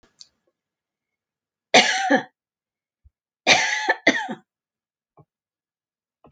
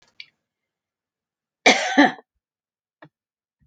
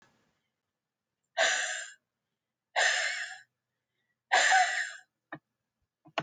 {"three_cough_length": "6.3 s", "three_cough_amplitude": 30528, "three_cough_signal_mean_std_ratio": 0.3, "cough_length": "3.7 s", "cough_amplitude": 32767, "cough_signal_mean_std_ratio": 0.24, "exhalation_length": "6.2 s", "exhalation_amplitude": 9193, "exhalation_signal_mean_std_ratio": 0.39, "survey_phase": "alpha (2021-03-01 to 2021-08-12)", "age": "65+", "gender": "Female", "wearing_mask": "No", "symptom_none": true, "smoker_status": "Ex-smoker", "respiratory_condition_asthma": false, "respiratory_condition_other": false, "recruitment_source": "REACT", "submission_delay": "1 day", "covid_test_result": "Negative", "covid_test_method": "RT-qPCR"}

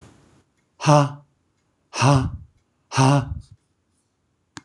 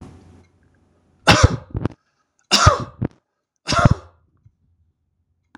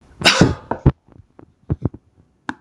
{"exhalation_length": "4.6 s", "exhalation_amplitude": 24033, "exhalation_signal_mean_std_ratio": 0.37, "three_cough_length": "5.6 s", "three_cough_amplitude": 26028, "three_cough_signal_mean_std_ratio": 0.3, "cough_length": "2.6 s", "cough_amplitude": 26028, "cough_signal_mean_std_ratio": 0.33, "survey_phase": "beta (2021-08-13 to 2022-03-07)", "age": "65+", "gender": "Male", "wearing_mask": "No", "symptom_none": true, "smoker_status": "Ex-smoker", "respiratory_condition_asthma": false, "respiratory_condition_other": false, "recruitment_source": "REACT", "submission_delay": "7 days", "covid_test_result": "Negative", "covid_test_method": "RT-qPCR", "influenza_a_test_result": "Negative", "influenza_b_test_result": "Negative"}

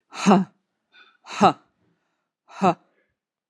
{"exhalation_length": "3.5 s", "exhalation_amplitude": 27935, "exhalation_signal_mean_std_ratio": 0.28, "survey_phase": "beta (2021-08-13 to 2022-03-07)", "age": "45-64", "gender": "Female", "wearing_mask": "No", "symptom_cough_any": true, "symptom_runny_or_blocked_nose": true, "symptom_fatigue": true, "symptom_fever_high_temperature": true, "symptom_headache": true, "symptom_other": true, "smoker_status": "Ex-smoker", "respiratory_condition_asthma": false, "respiratory_condition_other": false, "recruitment_source": "Test and Trace", "submission_delay": "1 day", "covid_test_result": "Positive", "covid_test_method": "RT-qPCR"}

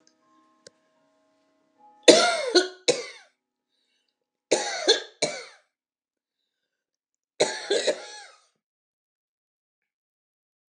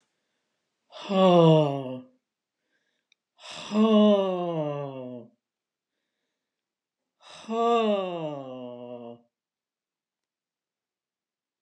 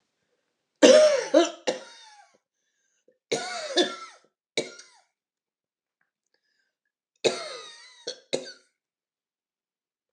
{"three_cough_length": "10.7 s", "three_cough_amplitude": 31621, "three_cough_signal_mean_std_ratio": 0.27, "exhalation_length": "11.6 s", "exhalation_amplitude": 14603, "exhalation_signal_mean_std_ratio": 0.39, "cough_length": "10.1 s", "cough_amplitude": 27647, "cough_signal_mean_std_ratio": 0.27, "survey_phase": "alpha (2021-03-01 to 2021-08-12)", "age": "65+", "gender": "Female", "wearing_mask": "No", "symptom_fatigue": true, "symptom_headache": true, "smoker_status": "Never smoked", "respiratory_condition_asthma": false, "respiratory_condition_other": false, "recruitment_source": "REACT", "submission_delay": "1 day", "covid_test_result": "Negative", "covid_test_method": "RT-qPCR"}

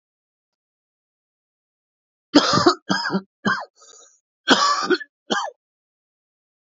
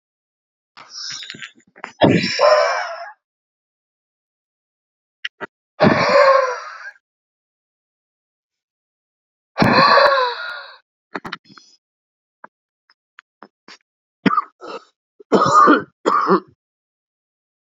{"cough_length": "6.7 s", "cough_amplitude": 29356, "cough_signal_mean_std_ratio": 0.35, "exhalation_length": "17.7 s", "exhalation_amplitude": 29711, "exhalation_signal_mean_std_ratio": 0.37, "survey_phase": "beta (2021-08-13 to 2022-03-07)", "age": "45-64", "gender": "Male", "wearing_mask": "No", "symptom_cough_any": true, "symptom_runny_or_blocked_nose": true, "symptom_fatigue": true, "symptom_headache": true, "symptom_loss_of_taste": true, "symptom_onset": "3 days", "smoker_status": "Current smoker (e-cigarettes or vapes only)", "respiratory_condition_asthma": false, "respiratory_condition_other": false, "recruitment_source": "Test and Trace", "submission_delay": "2 days", "covid_test_result": "Positive", "covid_test_method": "RT-qPCR", "covid_ct_value": 28.3, "covid_ct_gene": "N gene"}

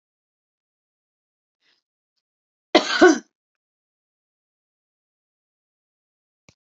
{"cough_length": "6.7 s", "cough_amplitude": 28410, "cough_signal_mean_std_ratio": 0.16, "survey_phase": "beta (2021-08-13 to 2022-03-07)", "age": "65+", "gender": "Female", "wearing_mask": "No", "symptom_cough_any": true, "symptom_diarrhoea": true, "symptom_fatigue": true, "symptom_fever_high_temperature": true, "symptom_change_to_sense_of_smell_or_taste": true, "symptom_loss_of_taste": true, "symptom_onset": "3 days", "smoker_status": "Never smoked", "respiratory_condition_asthma": true, "respiratory_condition_other": false, "recruitment_source": "Test and Trace", "submission_delay": "2 days", "covid_test_result": "Positive", "covid_test_method": "RT-qPCR"}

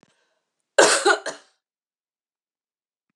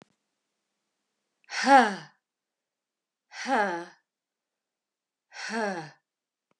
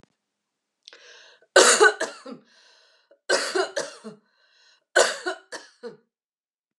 {"cough_length": "3.2 s", "cough_amplitude": 31555, "cough_signal_mean_std_ratio": 0.27, "exhalation_length": "6.6 s", "exhalation_amplitude": 18347, "exhalation_signal_mean_std_ratio": 0.27, "three_cough_length": "6.8 s", "three_cough_amplitude": 31910, "three_cough_signal_mean_std_ratio": 0.31, "survey_phase": "beta (2021-08-13 to 2022-03-07)", "age": "45-64", "gender": "Female", "wearing_mask": "No", "symptom_cough_any": true, "symptom_runny_or_blocked_nose": true, "symptom_sore_throat": true, "smoker_status": "Never smoked", "respiratory_condition_asthma": false, "respiratory_condition_other": false, "recruitment_source": "Test and Trace", "submission_delay": "1 day", "covid_test_result": "Positive", "covid_test_method": "RT-qPCR", "covid_ct_value": 19.5, "covid_ct_gene": "ORF1ab gene"}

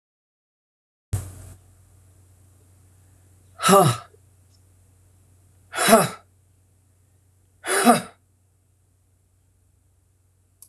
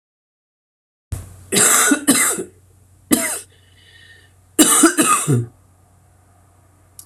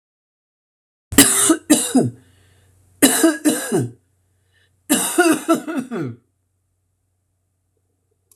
{"exhalation_length": "10.7 s", "exhalation_amplitude": 26369, "exhalation_signal_mean_std_ratio": 0.26, "cough_length": "7.1 s", "cough_amplitude": 28864, "cough_signal_mean_std_ratio": 0.43, "three_cough_length": "8.4 s", "three_cough_amplitude": 32768, "three_cough_signal_mean_std_ratio": 0.41, "survey_phase": "alpha (2021-03-01 to 2021-08-12)", "age": "45-64", "gender": "Female", "wearing_mask": "No", "symptom_cough_any": true, "symptom_fever_high_temperature": true, "symptom_headache": true, "smoker_status": "Ex-smoker", "respiratory_condition_asthma": false, "respiratory_condition_other": false, "recruitment_source": "Test and Trace", "submission_delay": "1 day", "covid_test_result": "Positive", "covid_test_method": "LFT"}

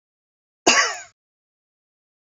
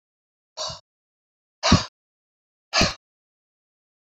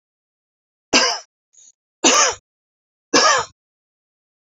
{"cough_length": "2.4 s", "cough_amplitude": 28715, "cough_signal_mean_std_ratio": 0.26, "exhalation_length": "4.0 s", "exhalation_amplitude": 24418, "exhalation_signal_mean_std_ratio": 0.25, "three_cough_length": "4.5 s", "three_cough_amplitude": 30488, "three_cough_signal_mean_std_ratio": 0.34, "survey_phase": "beta (2021-08-13 to 2022-03-07)", "age": "65+", "gender": "Female", "wearing_mask": "No", "symptom_none": true, "smoker_status": "Ex-smoker", "respiratory_condition_asthma": false, "respiratory_condition_other": false, "recruitment_source": "REACT", "submission_delay": "1 day", "covid_test_result": "Negative", "covid_test_method": "RT-qPCR", "influenza_a_test_result": "Negative", "influenza_b_test_result": "Negative"}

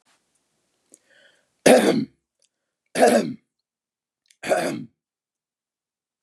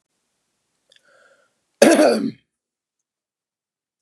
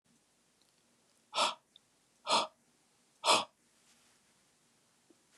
{"three_cough_length": "6.2 s", "three_cough_amplitude": 30611, "three_cough_signal_mean_std_ratio": 0.3, "cough_length": "4.0 s", "cough_amplitude": 32768, "cough_signal_mean_std_ratio": 0.26, "exhalation_length": "5.4 s", "exhalation_amplitude": 7277, "exhalation_signal_mean_std_ratio": 0.26, "survey_phase": "beta (2021-08-13 to 2022-03-07)", "age": "18-44", "gender": "Male", "wearing_mask": "No", "symptom_none": true, "smoker_status": "Never smoked", "respiratory_condition_asthma": false, "respiratory_condition_other": false, "recruitment_source": "REACT", "submission_delay": "1 day", "covid_test_result": "Negative", "covid_test_method": "RT-qPCR", "influenza_a_test_result": "Negative", "influenza_b_test_result": "Negative"}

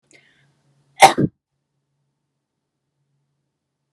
{"cough_length": "3.9 s", "cough_amplitude": 32768, "cough_signal_mean_std_ratio": 0.16, "survey_phase": "beta (2021-08-13 to 2022-03-07)", "age": "18-44", "gender": "Female", "wearing_mask": "No", "symptom_none": true, "symptom_onset": "10 days", "smoker_status": "Never smoked", "respiratory_condition_asthma": false, "respiratory_condition_other": false, "recruitment_source": "REACT", "submission_delay": "2 days", "covid_test_result": "Negative", "covid_test_method": "RT-qPCR", "influenza_a_test_result": "Negative", "influenza_b_test_result": "Negative"}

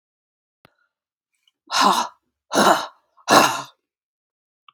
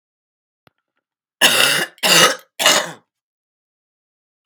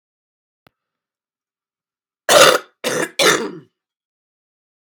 {"exhalation_length": "4.7 s", "exhalation_amplitude": 32768, "exhalation_signal_mean_std_ratio": 0.34, "three_cough_length": "4.5 s", "three_cough_amplitude": 32768, "three_cough_signal_mean_std_ratio": 0.38, "cough_length": "4.8 s", "cough_amplitude": 32768, "cough_signal_mean_std_ratio": 0.3, "survey_phase": "alpha (2021-03-01 to 2021-08-12)", "age": "65+", "gender": "Female", "wearing_mask": "No", "symptom_cough_any": true, "symptom_change_to_sense_of_smell_or_taste": true, "symptom_loss_of_taste": true, "symptom_onset": "6 days", "smoker_status": "Never smoked", "respiratory_condition_asthma": false, "respiratory_condition_other": false, "recruitment_source": "Test and Trace", "submission_delay": "2 days", "covid_test_result": "Positive", "covid_test_method": "RT-qPCR"}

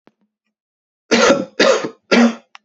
{"three_cough_length": "2.6 s", "three_cough_amplitude": 29740, "three_cough_signal_mean_std_ratio": 0.46, "survey_phase": "beta (2021-08-13 to 2022-03-07)", "age": "18-44", "gender": "Male", "wearing_mask": "No", "symptom_cough_any": true, "symptom_runny_or_blocked_nose": true, "symptom_sore_throat": true, "symptom_fatigue": true, "symptom_fever_high_temperature": true, "symptom_headache": true, "symptom_onset": "3 days", "smoker_status": "Never smoked", "respiratory_condition_asthma": false, "respiratory_condition_other": false, "recruitment_source": "Test and Trace", "submission_delay": "2 days", "covid_test_result": "Positive", "covid_test_method": "RT-qPCR"}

